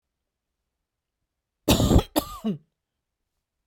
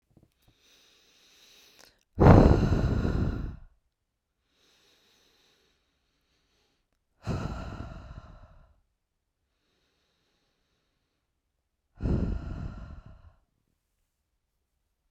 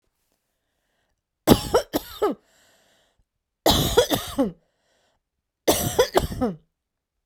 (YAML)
cough_length: 3.7 s
cough_amplitude: 20077
cough_signal_mean_std_ratio: 0.29
exhalation_length: 15.1 s
exhalation_amplitude: 28760
exhalation_signal_mean_std_ratio: 0.26
three_cough_length: 7.3 s
three_cough_amplitude: 32767
three_cough_signal_mean_std_ratio: 0.37
survey_phase: beta (2021-08-13 to 2022-03-07)
age: 45-64
gender: Female
wearing_mask: 'No'
symptom_runny_or_blocked_nose: true
symptom_headache: true
symptom_onset: 4 days
smoker_status: Ex-smoker
respiratory_condition_asthma: false
respiratory_condition_other: false
recruitment_source: REACT
submission_delay: 1 day
covid_test_result: Negative
covid_test_method: RT-qPCR